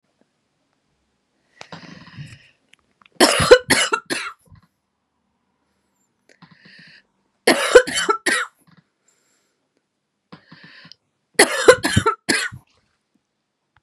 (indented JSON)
{
  "three_cough_length": "13.8 s",
  "three_cough_amplitude": 32768,
  "three_cough_signal_mean_std_ratio": 0.28,
  "survey_phase": "beta (2021-08-13 to 2022-03-07)",
  "age": "18-44",
  "gender": "Female",
  "wearing_mask": "No",
  "symptom_none": true,
  "smoker_status": "Never smoked",
  "respiratory_condition_asthma": false,
  "respiratory_condition_other": false,
  "recruitment_source": "REACT",
  "submission_delay": "1 day",
  "covid_test_result": "Negative",
  "covid_test_method": "RT-qPCR"
}